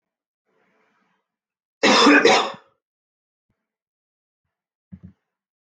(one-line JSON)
{"cough_length": "5.6 s", "cough_amplitude": 24776, "cough_signal_mean_std_ratio": 0.27, "survey_phase": "beta (2021-08-13 to 2022-03-07)", "age": "45-64", "gender": "Male", "wearing_mask": "No", "symptom_none": true, "smoker_status": "Never smoked", "respiratory_condition_asthma": false, "respiratory_condition_other": false, "recruitment_source": "REACT", "submission_delay": "0 days", "covid_test_result": "Negative", "covid_test_method": "RT-qPCR"}